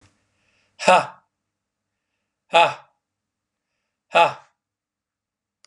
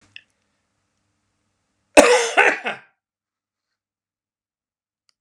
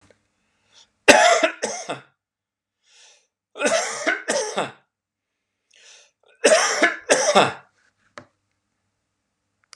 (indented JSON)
{
  "exhalation_length": "5.7 s",
  "exhalation_amplitude": 30982,
  "exhalation_signal_mean_std_ratio": 0.23,
  "cough_length": "5.2 s",
  "cough_amplitude": 32768,
  "cough_signal_mean_std_ratio": 0.24,
  "three_cough_length": "9.8 s",
  "three_cough_amplitude": 32768,
  "three_cough_signal_mean_std_ratio": 0.36,
  "survey_phase": "beta (2021-08-13 to 2022-03-07)",
  "age": "65+",
  "gender": "Male",
  "wearing_mask": "No",
  "symptom_none": true,
  "smoker_status": "Ex-smoker",
  "respiratory_condition_asthma": true,
  "respiratory_condition_other": false,
  "recruitment_source": "REACT",
  "submission_delay": "0 days",
  "covid_test_result": "Negative",
  "covid_test_method": "RT-qPCR",
  "influenza_a_test_result": "Negative",
  "influenza_b_test_result": "Negative"
}